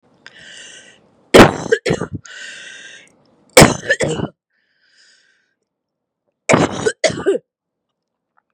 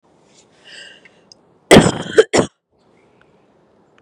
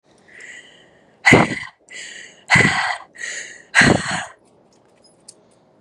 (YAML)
three_cough_length: 8.5 s
three_cough_amplitude: 32768
three_cough_signal_mean_std_ratio: 0.31
cough_length: 4.0 s
cough_amplitude: 32768
cough_signal_mean_std_ratio: 0.26
exhalation_length: 5.8 s
exhalation_amplitude: 32768
exhalation_signal_mean_std_ratio: 0.38
survey_phase: beta (2021-08-13 to 2022-03-07)
age: 18-44
gender: Female
wearing_mask: 'No'
symptom_cough_any: true
symptom_runny_or_blocked_nose: true
symptom_shortness_of_breath: true
symptom_sore_throat: true
symptom_fatigue: true
symptom_fever_high_temperature: true
smoker_status: Never smoked
respiratory_condition_asthma: false
respiratory_condition_other: false
recruitment_source: Test and Trace
submission_delay: 2 days
covid_test_result: Positive
covid_test_method: LFT